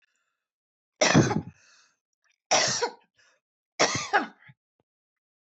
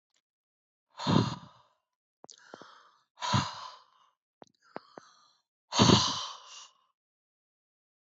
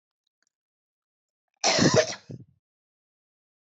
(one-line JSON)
{"three_cough_length": "5.5 s", "three_cough_amplitude": 14334, "three_cough_signal_mean_std_ratio": 0.34, "exhalation_length": "8.1 s", "exhalation_amplitude": 14662, "exhalation_signal_mean_std_ratio": 0.28, "cough_length": "3.7 s", "cough_amplitude": 13783, "cough_signal_mean_std_ratio": 0.28, "survey_phase": "beta (2021-08-13 to 2022-03-07)", "age": "65+", "gender": "Female", "wearing_mask": "No", "symptom_none": true, "smoker_status": "Ex-smoker", "respiratory_condition_asthma": false, "respiratory_condition_other": false, "recruitment_source": "REACT", "submission_delay": "2 days", "covid_test_result": "Negative", "covid_test_method": "RT-qPCR", "influenza_a_test_result": "Negative", "influenza_b_test_result": "Negative"}